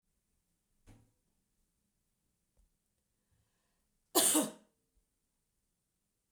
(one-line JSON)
{"cough_length": "6.3 s", "cough_amplitude": 6623, "cough_signal_mean_std_ratio": 0.19, "survey_phase": "beta (2021-08-13 to 2022-03-07)", "age": "65+", "gender": "Female", "wearing_mask": "No", "symptom_none": true, "smoker_status": "Never smoked", "respiratory_condition_asthma": false, "respiratory_condition_other": false, "recruitment_source": "REACT", "submission_delay": "2 days", "covid_test_result": "Negative", "covid_test_method": "RT-qPCR", "influenza_a_test_result": "Negative", "influenza_b_test_result": "Negative"}